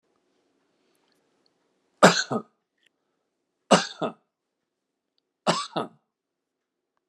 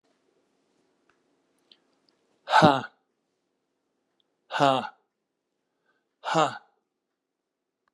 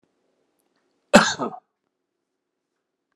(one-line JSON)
{"three_cough_length": "7.1 s", "three_cough_amplitude": 32767, "three_cough_signal_mean_std_ratio": 0.21, "exhalation_length": "7.9 s", "exhalation_amplitude": 24335, "exhalation_signal_mean_std_ratio": 0.23, "cough_length": "3.2 s", "cough_amplitude": 32768, "cough_signal_mean_std_ratio": 0.19, "survey_phase": "beta (2021-08-13 to 2022-03-07)", "age": "65+", "gender": "Male", "wearing_mask": "No", "symptom_none": true, "smoker_status": "Ex-smoker", "respiratory_condition_asthma": false, "respiratory_condition_other": false, "recruitment_source": "REACT", "submission_delay": "1 day", "covid_test_result": "Negative", "covid_test_method": "RT-qPCR"}